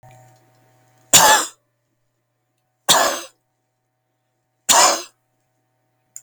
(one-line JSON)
{"three_cough_length": "6.2 s", "three_cough_amplitude": 32768, "three_cough_signal_mean_std_ratio": 0.3, "survey_phase": "beta (2021-08-13 to 2022-03-07)", "age": "45-64", "gender": "Male", "wearing_mask": "No", "symptom_runny_or_blocked_nose": true, "smoker_status": "Never smoked", "respiratory_condition_asthma": false, "respiratory_condition_other": false, "recruitment_source": "REACT", "submission_delay": "1 day", "covid_test_result": "Negative", "covid_test_method": "RT-qPCR"}